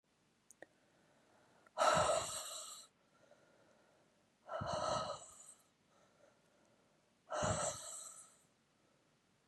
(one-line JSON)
{"exhalation_length": "9.5 s", "exhalation_amplitude": 3555, "exhalation_signal_mean_std_ratio": 0.39, "survey_phase": "beta (2021-08-13 to 2022-03-07)", "age": "45-64", "gender": "Female", "wearing_mask": "No", "symptom_new_continuous_cough": true, "symptom_runny_or_blocked_nose": true, "symptom_other": true, "symptom_onset": "3 days", "smoker_status": "Never smoked", "respiratory_condition_asthma": false, "respiratory_condition_other": false, "recruitment_source": "Test and Trace", "submission_delay": "1 day", "covid_test_result": "Positive", "covid_test_method": "RT-qPCR", "covid_ct_value": 18.5, "covid_ct_gene": "ORF1ab gene", "covid_ct_mean": 18.6, "covid_viral_load": "800000 copies/ml", "covid_viral_load_category": "Low viral load (10K-1M copies/ml)"}